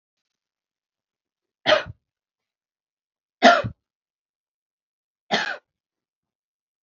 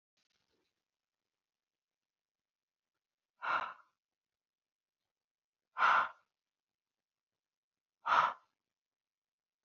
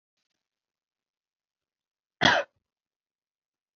{"three_cough_length": "6.8 s", "three_cough_amplitude": 32609, "three_cough_signal_mean_std_ratio": 0.2, "exhalation_length": "9.6 s", "exhalation_amplitude": 6178, "exhalation_signal_mean_std_ratio": 0.22, "cough_length": "3.8 s", "cough_amplitude": 17525, "cough_signal_mean_std_ratio": 0.18, "survey_phase": "alpha (2021-03-01 to 2021-08-12)", "age": "45-64", "gender": "Female", "wearing_mask": "No", "symptom_none": true, "symptom_onset": "13 days", "smoker_status": "Never smoked", "respiratory_condition_asthma": false, "respiratory_condition_other": false, "recruitment_source": "REACT", "submission_delay": "1 day", "covid_test_result": "Negative", "covid_test_method": "RT-qPCR"}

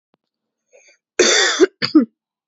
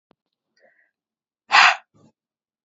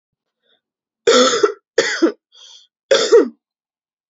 {"cough_length": "2.5 s", "cough_amplitude": 32483, "cough_signal_mean_std_ratio": 0.4, "exhalation_length": "2.6 s", "exhalation_amplitude": 28779, "exhalation_signal_mean_std_ratio": 0.23, "three_cough_length": "4.1 s", "three_cough_amplitude": 28630, "three_cough_signal_mean_std_ratio": 0.4, "survey_phase": "beta (2021-08-13 to 2022-03-07)", "age": "18-44", "gender": "Female", "wearing_mask": "No", "symptom_cough_any": true, "symptom_sore_throat": true, "symptom_fatigue": true, "symptom_fever_high_temperature": true, "symptom_headache": true, "symptom_onset": "4 days", "smoker_status": "Ex-smoker", "respiratory_condition_asthma": false, "respiratory_condition_other": false, "recruitment_source": "Test and Trace", "submission_delay": "1 day", "covid_test_result": "Positive", "covid_test_method": "RT-qPCR", "covid_ct_value": 19.7, "covid_ct_gene": "N gene", "covid_ct_mean": 20.2, "covid_viral_load": "230000 copies/ml", "covid_viral_load_category": "Low viral load (10K-1M copies/ml)"}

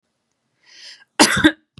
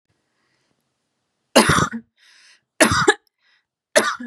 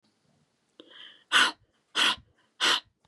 {"cough_length": "1.8 s", "cough_amplitude": 32768, "cough_signal_mean_std_ratio": 0.31, "three_cough_length": "4.3 s", "three_cough_amplitude": 32767, "three_cough_signal_mean_std_ratio": 0.34, "exhalation_length": "3.1 s", "exhalation_amplitude": 12994, "exhalation_signal_mean_std_ratio": 0.35, "survey_phase": "beta (2021-08-13 to 2022-03-07)", "age": "18-44", "gender": "Female", "wearing_mask": "No", "symptom_none": true, "symptom_onset": "8 days", "smoker_status": "Never smoked", "respiratory_condition_asthma": true, "respiratory_condition_other": false, "recruitment_source": "REACT", "submission_delay": "3 days", "covid_test_result": "Negative", "covid_test_method": "RT-qPCR", "influenza_a_test_result": "Negative", "influenza_b_test_result": "Negative"}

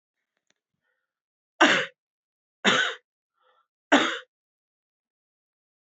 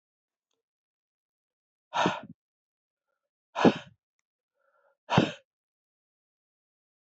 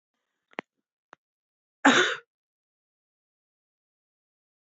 {"three_cough_length": "5.9 s", "three_cough_amplitude": 21491, "three_cough_signal_mean_std_ratio": 0.26, "exhalation_length": "7.2 s", "exhalation_amplitude": 16854, "exhalation_signal_mean_std_ratio": 0.2, "cough_length": "4.8 s", "cough_amplitude": 19057, "cough_signal_mean_std_ratio": 0.19, "survey_phase": "beta (2021-08-13 to 2022-03-07)", "age": "45-64", "gender": "Male", "wearing_mask": "No", "symptom_cough_any": true, "symptom_shortness_of_breath": true, "symptom_sore_throat": true, "symptom_onset": "5 days", "smoker_status": "Never smoked", "respiratory_condition_asthma": false, "respiratory_condition_other": false, "recruitment_source": "Test and Trace", "submission_delay": "1 day", "covid_test_result": "Positive", "covid_test_method": "RT-qPCR", "covid_ct_value": 23.8, "covid_ct_gene": "N gene"}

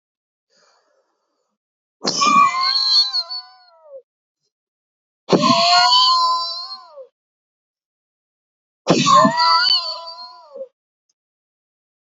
{"exhalation_length": "12.0 s", "exhalation_amplitude": 31267, "exhalation_signal_mean_std_ratio": 0.47, "survey_phase": "beta (2021-08-13 to 2022-03-07)", "age": "18-44", "gender": "Male", "wearing_mask": "No", "symptom_headache": true, "symptom_change_to_sense_of_smell_or_taste": true, "symptom_loss_of_taste": true, "symptom_other": true, "smoker_status": "Ex-smoker", "respiratory_condition_asthma": false, "respiratory_condition_other": false, "recruitment_source": "Test and Trace", "submission_delay": "1 day", "covid_test_result": "Positive", "covid_test_method": "RT-qPCR"}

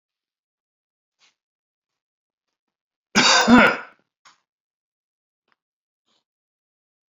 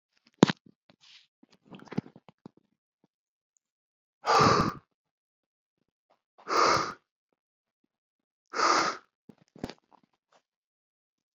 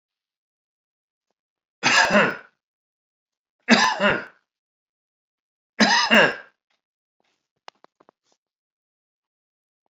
{"cough_length": "7.1 s", "cough_amplitude": 28274, "cough_signal_mean_std_ratio": 0.23, "exhalation_length": "11.3 s", "exhalation_amplitude": 25309, "exhalation_signal_mean_std_ratio": 0.26, "three_cough_length": "9.9 s", "three_cough_amplitude": 27760, "three_cough_signal_mean_std_ratio": 0.3, "survey_phase": "beta (2021-08-13 to 2022-03-07)", "age": "45-64", "gender": "Male", "wearing_mask": "No", "symptom_cough_any": true, "symptom_fatigue": true, "symptom_fever_high_temperature": true, "symptom_headache": true, "symptom_change_to_sense_of_smell_or_taste": true, "symptom_loss_of_taste": true, "symptom_onset": "5 days", "smoker_status": "Never smoked", "respiratory_condition_asthma": false, "respiratory_condition_other": false, "recruitment_source": "Test and Trace", "submission_delay": "2 days", "covid_test_result": "Positive", "covid_test_method": "RT-qPCR", "covid_ct_value": 10.8, "covid_ct_gene": "ORF1ab gene", "covid_ct_mean": 11.2, "covid_viral_load": "210000000 copies/ml", "covid_viral_load_category": "High viral load (>1M copies/ml)"}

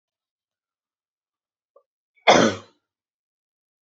{"cough_length": "3.8 s", "cough_amplitude": 27492, "cough_signal_mean_std_ratio": 0.2, "survey_phase": "beta (2021-08-13 to 2022-03-07)", "age": "18-44", "gender": "Female", "wearing_mask": "No", "symptom_none": true, "smoker_status": "Never smoked", "respiratory_condition_asthma": false, "respiratory_condition_other": false, "recruitment_source": "REACT", "submission_delay": "1 day", "covid_test_result": "Negative", "covid_test_method": "RT-qPCR"}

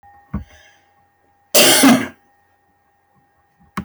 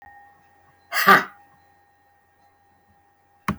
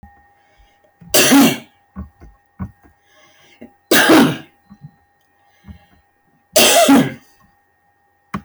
{"cough_length": "3.8 s", "cough_amplitude": 29540, "cough_signal_mean_std_ratio": 0.33, "exhalation_length": "3.6 s", "exhalation_amplitude": 23814, "exhalation_signal_mean_std_ratio": 0.24, "three_cough_length": "8.4 s", "three_cough_amplitude": 27523, "three_cough_signal_mean_std_ratio": 0.38, "survey_phase": "beta (2021-08-13 to 2022-03-07)", "age": "65+", "gender": "Female", "wearing_mask": "No", "symptom_shortness_of_breath": true, "smoker_status": "Ex-smoker", "respiratory_condition_asthma": false, "respiratory_condition_other": false, "recruitment_source": "REACT", "submission_delay": "1 day", "covid_test_result": "Negative", "covid_test_method": "RT-qPCR"}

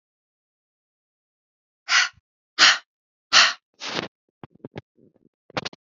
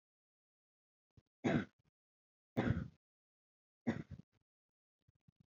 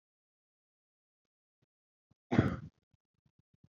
{"exhalation_length": "5.8 s", "exhalation_amplitude": 27865, "exhalation_signal_mean_std_ratio": 0.26, "three_cough_length": "5.5 s", "three_cough_amplitude": 2512, "three_cough_signal_mean_std_ratio": 0.26, "cough_length": "3.8 s", "cough_amplitude": 8117, "cough_signal_mean_std_ratio": 0.18, "survey_phase": "beta (2021-08-13 to 2022-03-07)", "age": "18-44", "gender": "Female", "wearing_mask": "No", "symptom_none": true, "smoker_status": "Never smoked", "respiratory_condition_asthma": false, "respiratory_condition_other": false, "recruitment_source": "REACT", "submission_delay": "12 days", "covid_test_result": "Negative", "covid_test_method": "RT-qPCR", "influenza_a_test_result": "Negative", "influenza_b_test_result": "Negative"}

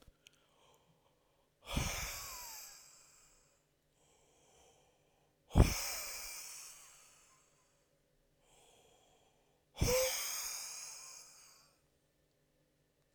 {"exhalation_length": "13.1 s", "exhalation_amplitude": 11041, "exhalation_signal_mean_std_ratio": 0.3, "survey_phase": "beta (2021-08-13 to 2022-03-07)", "age": "18-44", "gender": "Male", "wearing_mask": "No", "symptom_cough_any": true, "symptom_fatigue": true, "symptom_headache": true, "symptom_onset": "3 days", "smoker_status": "Never smoked", "respiratory_condition_asthma": true, "respiratory_condition_other": false, "recruitment_source": "REACT", "submission_delay": "1 day", "covid_test_result": "Negative", "covid_test_method": "RT-qPCR"}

